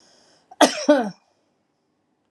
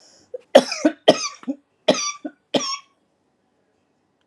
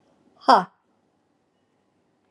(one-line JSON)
{"cough_length": "2.3 s", "cough_amplitude": 29227, "cough_signal_mean_std_ratio": 0.29, "three_cough_length": "4.3 s", "three_cough_amplitude": 32768, "three_cough_signal_mean_std_ratio": 0.29, "exhalation_length": "2.3 s", "exhalation_amplitude": 28167, "exhalation_signal_mean_std_ratio": 0.19, "survey_phase": "alpha (2021-03-01 to 2021-08-12)", "age": "45-64", "gender": "Female", "wearing_mask": "No", "symptom_none": true, "smoker_status": "Ex-smoker", "respiratory_condition_asthma": false, "respiratory_condition_other": true, "recruitment_source": "Test and Trace", "submission_delay": "0 days", "covid_test_result": "Negative", "covid_test_method": "LFT"}